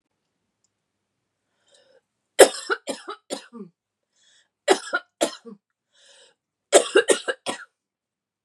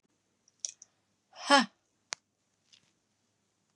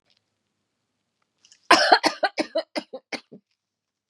three_cough_length: 8.4 s
three_cough_amplitude: 32768
three_cough_signal_mean_std_ratio: 0.23
exhalation_length: 3.8 s
exhalation_amplitude: 11231
exhalation_signal_mean_std_ratio: 0.18
cough_length: 4.1 s
cough_amplitude: 29415
cough_signal_mean_std_ratio: 0.27
survey_phase: beta (2021-08-13 to 2022-03-07)
age: 45-64
gender: Female
wearing_mask: 'No'
symptom_none: true
smoker_status: Never smoked
respiratory_condition_asthma: false
respiratory_condition_other: false
recruitment_source: REACT
submission_delay: 1 day
covid_test_result: Negative
covid_test_method: RT-qPCR
influenza_a_test_result: Negative
influenza_b_test_result: Negative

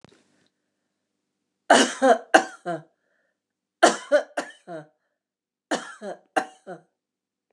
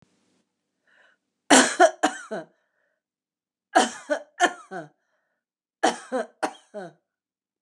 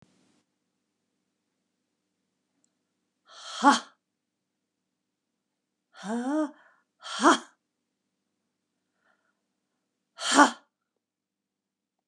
three_cough_length: 7.5 s
three_cough_amplitude: 28680
three_cough_signal_mean_std_ratio: 0.28
cough_length: 7.6 s
cough_amplitude: 28695
cough_signal_mean_std_ratio: 0.29
exhalation_length: 12.1 s
exhalation_amplitude: 24708
exhalation_signal_mean_std_ratio: 0.21
survey_phase: beta (2021-08-13 to 2022-03-07)
age: 65+
gender: Female
wearing_mask: 'No'
symptom_runny_or_blocked_nose: true
symptom_fatigue: true
symptom_headache: true
symptom_change_to_sense_of_smell_or_taste: true
symptom_loss_of_taste: true
smoker_status: Never smoked
respiratory_condition_asthma: false
respiratory_condition_other: false
recruitment_source: REACT
submission_delay: 6 days
covid_test_result: Negative
covid_test_method: RT-qPCR
influenza_a_test_result: Unknown/Void
influenza_b_test_result: Unknown/Void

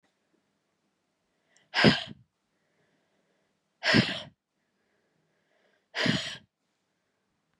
exhalation_length: 7.6 s
exhalation_amplitude: 17597
exhalation_signal_mean_std_ratio: 0.25
survey_phase: beta (2021-08-13 to 2022-03-07)
age: 45-64
gender: Female
wearing_mask: 'No'
symptom_new_continuous_cough: true
symptom_runny_or_blocked_nose: true
symptom_shortness_of_breath: true
symptom_sore_throat: true
symptom_fatigue: true
symptom_fever_high_temperature: true
symptom_headache: true
symptom_change_to_sense_of_smell_or_taste: true
symptom_onset: 3 days
smoker_status: Never smoked
respiratory_condition_asthma: false
respiratory_condition_other: false
recruitment_source: Test and Trace
submission_delay: 2 days
covid_test_result: Positive
covid_test_method: RT-qPCR
covid_ct_value: 25.1
covid_ct_gene: ORF1ab gene
covid_ct_mean: 25.7
covid_viral_load: 3700 copies/ml
covid_viral_load_category: Minimal viral load (< 10K copies/ml)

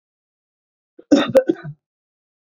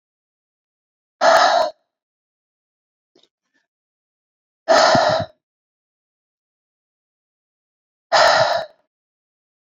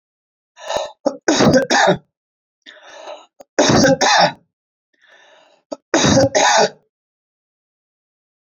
cough_length: 2.6 s
cough_amplitude: 27422
cough_signal_mean_std_ratio: 0.27
exhalation_length: 9.6 s
exhalation_amplitude: 27105
exhalation_signal_mean_std_ratio: 0.32
three_cough_length: 8.5 s
three_cough_amplitude: 28425
three_cough_signal_mean_std_ratio: 0.44
survey_phase: beta (2021-08-13 to 2022-03-07)
age: 45-64
gender: Male
wearing_mask: 'No'
symptom_none: true
smoker_status: Current smoker (e-cigarettes or vapes only)
respiratory_condition_asthma: false
respiratory_condition_other: false
recruitment_source: REACT
submission_delay: 0 days
covid_test_result: Negative
covid_test_method: RT-qPCR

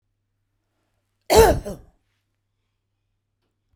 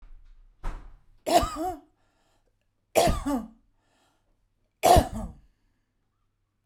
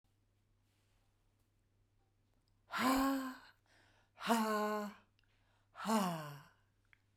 cough_length: 3.8 s
cough_amplitude: 32767
cough_signal_mean_std_ratio: 0.23
three_cough_length: 6.7 s
three_cough_amplitude: 22480
three_cough_signal_mean_std_ratio: 0.33
exhalation_length: 7.2 s
exhalation_amplitude: 3916
exhalation_signal_mean_std_ratio: 0.42
survey_phase: beta (2021-08-13 to 2022-03-07)
age: 45-64
gender: Female
wearing_mask: 'No'
symptom_none: true
symptom_onset: 5 days
smoker_status: Ex-smoker
respiratory_condition_asthma: false
respiratory_condition_other: false
recruitment_source: REACT
submission_delay: 0 days
covid_test_result: Negative
covid_test_method: RT-qPCR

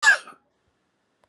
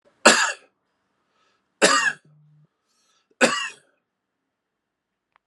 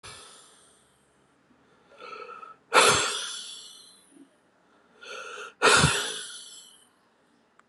cough_length: 1.3 s
cough_amplitude: 17507
cough_signal_mean_std_ratio: 0.27
three_cough_length: 5.5 s
three_cough_amplitude: 32767
three_cough_signal_mean_std_ratio: 0.28
exhalation_length: 7.7 s
exhalation_amplitude: 20876
exhalation_signal_mean_std_ratio: 0.34
survey_phase: beta (2021-08-13 to 2022-03-07)
age: 45-64
gender: Male
wearing_mask: 'No'
symptom_cough_any: true
symptom_runny_or_blocked_nose: true
symptom_shortness_of_breath: true
symptom_sore_throat: true
symptom_fatigue: true
symptom_fever_high_temperature: true
symptom_headache: true
symptom_onset: 3 days
smoker_status: Never smoked
respiratory_condition_asthma: true
respiratory_condition_other: false
recruitment_source: Test and Trace
submission_delay: 2 days
covid_test_result: Positive
covid_test_method: RT-qPCR
covid_ct_value: 18.2
covid_ct_gene: ORF1ab gene
covid_ct_mean: 18.8
covid_viral_load: 700000 copies/ml
covid_viral_load_category: Low viral load (10K-1M copies/ml)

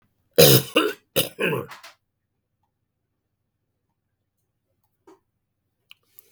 cough_length: 6.3 s
cough_amplitude: 32768
cough_signal_mean_std_ratio: 0.24
survey_phase: beta (2021-08-13 to 2022-03-07)
age: 65+
gender: Male
wearing_mask: 'No'
symptom_none: true
smoker_status: Never smoked
respiratory_condition_asthma: false
respiratory_condition_other: false
recruitment_source: REACT
submission_delay: 1 day
covid_test_result: Negative
covid_test_method: RT-qPCR
influenza_a_test_result: Negative
influenza_b_test_result: Negative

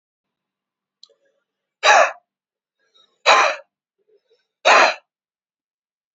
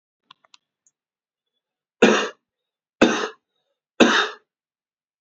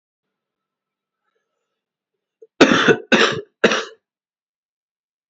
exhalation_length: 6.1 s
exhalation_amplitude: 29247
exhalation_signal_mean_std_ratio: 0.29
three_cough_length: 5.2 s
three_cough_amplitude: 29735
three_cough_signal_mean_std_ratio: 0.28
cough_length: 5.3 s
cough_amplitude: 32767
cough_signal_mean_std_ratio: 0.29
survey_phase: beta (2021-08-13 to 2022-03-07)
age: 18-44
gender: Male
wearing_mask: 'No'
symptom_cough_any: true
symptom_runny_or_blocked_nose: true
symptom_shortness_of_breath: true
symptom_sore_throat: true
symptom_fatigue: true
symptom_change_to_sense_of_smell_or_taste: true
smoker_status: Never smoked
respiratory_condition_asthma: true
respiratory_condition_other: false
recruitment_source: Test and Trace
submission_delay: 2 days
covid_test_result: Positive
covid_test_method: RT-qPCR
covid_ct_value: 17.5
covid_ct_gene: ORF1ab gene
covid_ct_mean: 17.8
covid_viral_load: 1400000 copies/ml
covid_viral_load_category: High viral load (>1M copies/ml)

